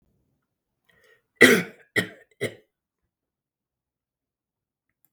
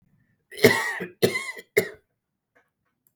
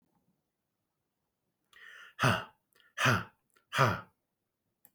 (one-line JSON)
{"three_cough_length": "5.1 s", "three_cough_amplitude": 32766, "three_cough_signal_mean_std_ratio": 0.19, "cough_length": "3.2 s", "cough_amplitude": 32191, "cough_signal_mean_std_ratio": 0.32, "exhalation_length": "4.9 s", "exhalation_amplitude": 8333, "exhalation_signal_mean_std_ratio": 0.3, "survey_phase": "beta (2021-08-13 to 2022-03-07)", "age": "45-64", "gender": "Male", "wearing_mask": "No", "symptom_none": true, "smoker_status": "Never smoked", "respiratory_condition_asthma": false, "respiratory_condition_other": false, "recruitment_source": "REACT", "submission_delay": "2 days", "covid_test_result": "Negative", "covid_test_method": "RT-qPCR", "influenza_a_test_result": "Negative", "influenza_b_test_result": "Negative"}